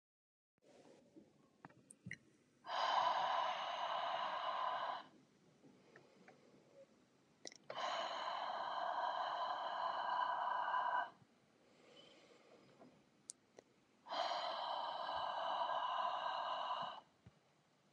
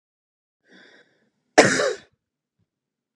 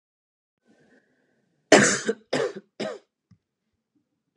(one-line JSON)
{"exhalation_length": "17.9 s", "exhalation_amplitude": 1891, "exhalation_signal_mean_std_ratio": 0.67, "cough_length": "3.2 s", "cough_amplitude": 32767, "cough_signal_mean_std_ratio": 0.23, "three_cough_length": "4.4 s", "three_cough_amplitude": 30007, "three_cough_signal_mean_std_ratio": 0.26, "survey_phase": "beta (2021-08-13 to 2022-03-07)", "age": "18-44", "gender": "Female", "wearing_mask": "No", "symptom_cough_any": true, "smoker_status": "Ex-smoker", "respiratory_condition_asthma": false, "respiratory_condition_other": false, "recruitment_source": "REACT", "submission_delay": "1 day", "covid_test_result": "Positive", "covid_test_method": "RT-qPCR", "covid_ct_value": 32.0, "covid_ct_gene": "N gene", "influenza_a_test_result": "Negative", "influenza_b_test_result": "Negative"}